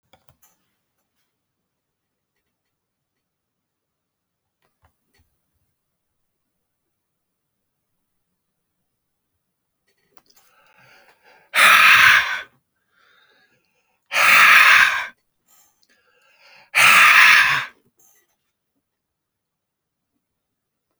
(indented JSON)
{
  "exhalation_length": "21.0 s",
  "exhalation_amplitude": 32768,
  "exhalation_signal_mean_std_ratio": 0.28,
  "survey_phase": "alpha (2021-03-01 to 2021-08-12)",
  "age": "65+",
  "gender": "Male",
  "wearing_mask": "No",
  "symptom_none": true,
  "smoker_status": "Ex-smoker",
  "respiratory_condition_asthma": false,
  "respiratory_condition_other": false,
  "recruitment_source": "REACT",
  "submission_delay": "5 days",
  "covid_test_result": "Negative",
  "covid_test_method": "RT-qPCR"
}